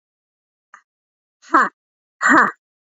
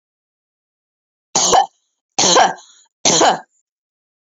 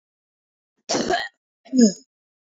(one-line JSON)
{"exhalation_length": "3.0 s", "exhalation_amplitude": 27842, "exhalation_signal_mean_std_ratio": 0.3, "three_cough_length": "4.3 s", "three_cough_amplitude": 31296, "three_cough_signal_mean_std_ratio": 0.4, "cough_length": "2.5 s", "cough_amplitude": 22618, "cough_signal_mean_std_ratio": 0.35, "survey_phase": "alpha (2021-03-01 to 2021-08-12)", "age": "18-44", "gender": "Female", "wearing_mask": "No", "symptom_cough_any": true, "smoker_status": "Prefer not to say", "respiratory_condition_asthma": false, "respiratory_condition_other": false, "recruitment_source": "Test and Trace", "submission_delay": "0 days", "covid_test_result": "Negative", "covid_test_method": "LFT"}